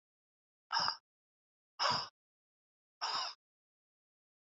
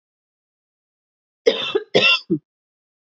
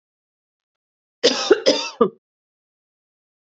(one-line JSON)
{"exhalation_length": "4.4 s", "exhalation_amplitude": 4176, "exhalation_signal_mean_std_ratio": 0.32, "three_cough_length": "3.2 s", "three_cough_amplitude": 27444, "three_cough_signal_mean_std_ratio": 0.33, "cough_length": "3.4 s", "cough_amplitude": 32703, "cough_signal_mean_std_ratio": 0.29, "survey_phase": "beta (2021-08-13 to 2022-03-07)", "age": "45-64", "gender": "Female", "wearing_mask": "No", "symptom_none": true, "smoker_status": "Never smoked", "respiratory_condition_asthma": true, "respiratory_condition_other": false, "recruitment_source": "REACT", "submission_delay": "1 day", "covid_test_result": "Negative", "covid_test_method": "RT-qPCR", "influenza_a_test_result": "Negative", "influenza_b_test_result": "Negative"}